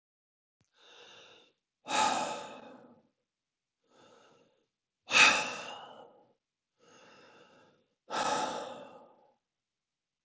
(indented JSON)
{
  "exhalation_length": "10.2 s",
  "exhalation_amplitude": 11267,
  "exhalation_signal_mean_std_ratio": 0.3,
  "survey_phase": "beta (2021-08-13 to 2022-03-07)",
  "age": "45-64",
  "gender": "Male",
  "wearing_mask": "No",
  "symptom_none": true,
  "smoker_status": "Ex-smoker",
  "respiratory_condition_asthma": false,
  "respiratory_condition_other": false,
  "recruitment_source": "REACT",
  "submission_delay": "3 days",
  "covid_test_result": "Negative",
  "covid_test_method": "RT-qPCR"
}